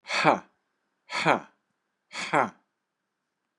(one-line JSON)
{"exhalation_length": "3.6 s", "exhalation_amplitude": 22016, "exhalation_signal_mean_std_ratio": 0.32, "survey_phase": "beta (2021-08-13 to 2022-03-07)", "age": "45-64", "gender": "Male", "wearing_mask": "No", "symptom_runny_or_blocked_nose": true, "smoker_status": "Never smoked", "respiratory_condition_asthma": false, "respiratory_condition_other": false, "recruitment_source": "REACT", "submission_delay": "4 days", "covid_test_result": "Negative", "covid_test_method": "RT-qPCR", "influenza_a_test_result": "Negative", "influenza_b_test_result": "Negative"}